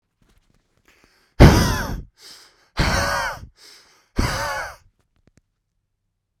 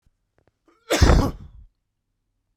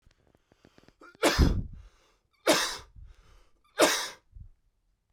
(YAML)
exhalation_length: 6.4 s
exhalation_amplitude: 32768
exhalation_signal_mean_std_ratio: 0.32
cough_length: 2.6 s
cough_amplitude: 30562
cough_signal_mean_std_ratio: 0.32
three_cough_length: 5.1 s
three_cough_amplitude: 14195
three_cough_signal_mean_std_ratio: 0.35
survey_phase: beta (2021-08-13 to 2022-03-07)
age: 18-44
gender: Male
wearing_mask: 'No'
symptom_shortness_of_breath: true
symptom_sore_throat: true
symptom_fatigue: true
symptom_headache: true
smoker_status: Never smoked
respiratory_condition_asthma: false
respiratory_condition_other: false
recruitment_source: Test and Trace
submission_delay: 2 days
covid_test_result: Positive
covid_test_method: ePCR